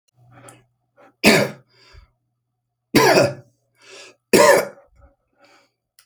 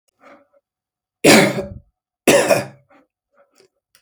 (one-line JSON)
{"three_cough_length": "6.1 s", "three_cough_amplitude": 31946, "three_cough_signal_mean_std_ratio": 0.33, "cough_length": "4.0 s", "cough_amplitude": 32767, "cough_signal_mean_std_ratio": 0.33, "survey_phase": "alpha (2021-03-01 to 2021-08-12)", "age": "65+", "gender": "Male", "wearing_mask": "No", "symptom_none": true, "smoker_status": "Never smoked", "respiratory_condition_asthma": false, "respiratory_condition_other": false, "recruitment_source": "REACT", "submission_delay": "2 days", "covid_test_result": "Negative", "covid_test_method": "RT-qPCR"}